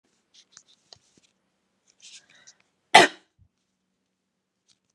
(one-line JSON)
{"cough_length": "4.9 s", "cough_amplitude": 32767, "cough_signal_mean_std_ratio": 0.13, "survey_phase": "alpha (2021-03-01 to 2021-08-12)", "age": "18-44", "gender": "Female", "wearing_mask": "No", "symptom_none": true, "smoker_status": "Never smoked", "respiratory_condition_asthma": false, "respiratory_condition_other": false, "recruitment_source": "REACT", "submission_delay": "1 day", "covid_test_result": "Negative", "covid_test_method": "RT-qPCR"}